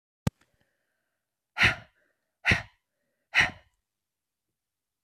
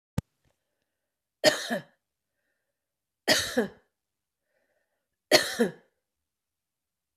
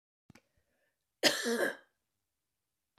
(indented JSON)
{
  "exhalation_length": "5.0 s",
  "exhalation_amplitude": 12698,
  "exhalation_signal_mean_std_ratio": 0.23,
  "three_cough_length": "7.2 s",
  "three_cough_amplitude": 19459,
  "three_cough_signal_mean_std_ratio": 0.25,
  "cough_length": "3.0 s",
  "cough_amplitude": 9434,
  "cough_signal_mean_std_ratio": 0.3,
  "survey_phase": "beta (2021-08-13 to 2022-03-07)",
  "age": "65+",
  "gender": "Female",
  "wearing_mask": "No",
  "symptom_none": true,
  "smoker_status": "Ex-smoker",
  "respiratory_condition_asthma": true,
  "respiratory_condition_other": false,
  "recruitment_source": "REACT",
  "submission_delay": "4 days",
  "covid_test_result": "Negative",
  "covid_test_method": "RT-qPCR"
}